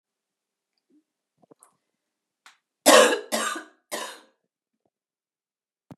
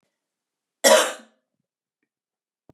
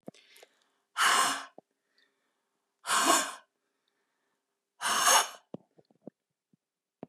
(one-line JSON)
{"three_cough_length": "6.0 s", "three_cough_amplitude": 27744, "three_cough_signal_mean_std_ratio": 0.23, "cough_length": "2.7 s", "cough_amplitude": 29158, "cough_signal_mean_std_ratio": 0.24, "exhalation_length": "7.1 s", "exhalation_amplitude": 11083, "exhalation_signal_mean_std_ratio": 0.35, "survey_phase": "beta (2021-08-13 to 2022-03-07)", "age": "45-64", "gender": "Female", "wearing_mask": "No", "symptom_cough_any": true, "symptom_new_continuous_cough": true, "symptom_runny_or_blocked_nose": true, "symptom_fatigue": true, "symptom_headache": true, "symptom_change_to_sense_of_smell_or_taste": true, "symptom_loss_of_taste": true, "smoker_status": "Never smoked", "respiratory_condition_asthma": false, "respiratory_condition_other": false, "recruitment_source": "Test and Trace", "submission_delay": "0 days", "covid_test_result": "Negative", "covid_test_method": "LFT"}